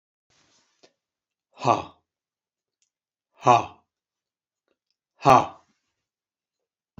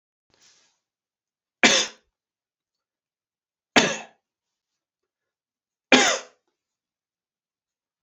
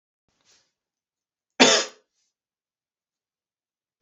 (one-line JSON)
{"exhalation_length": "7.0 s", "exhalation_amplitude": 26396, "exhalation_signal_mean_std_ratio": 0.19, "three_cough_length": "8.0 s", "three_cough_amplitude": 29503, "three_cough_signal_mean_std_ratio": 0.21, "cough_length": "4.0 s", "cough_amplitude": 27748, "cough_signal_mean_std_ratio": 0.19, "survey_phase": "beta (2021-08-13 to 2022-03-07)", "age": "65+", "gender": "Male", "wearing_mask": "No", "symptom_none": true, "smoker_status": "Ex-smoker", "respiratory_condition_asthma": false, "respiratory_condition_other": false, "recruitment_source": "REACT", "submission_delay": "1 day", "covid_test_result": "Negative", "covid_test_method": "RT-qPCR", "influenza_a_test_result": "Negative", "influenza_b_test_result": "Negative"}